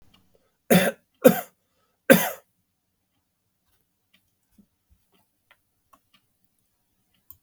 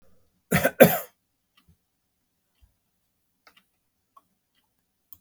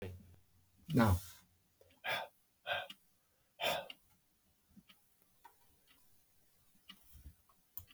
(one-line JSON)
{"three_cough_length": "7.4 s", "three_cough_amplitude": 32767, "three_cough_signal_mean_std_ratio": 0.19, "cough_length": "5.2 s", "cough_amplitude": 32768, "cough_signal_mean_std_ratio": 0.17, "exhalation_length": "7.9 s", "exhalation_amplitude": 3740, "exhalation_signal_mean_std_ratio": 0.3, "survey_phase": "beta (2021-08-13 to 2022-03-07)", "age": "45-64", "gender": "Male", "wearing_mask": "No", "symptom_none": true, "smoker_status": "Never smoked", "respiratory_condition_asthma": false, "respiratory_condition_other": false, "recruitment_source": "REACT", "submission_delay": "6 days", "covid_test_result": "Negative", "covid_test_method": "RT-qPCR", "influenza_a_test_result": "Negative", "influenza_b_test_result": "Negative"}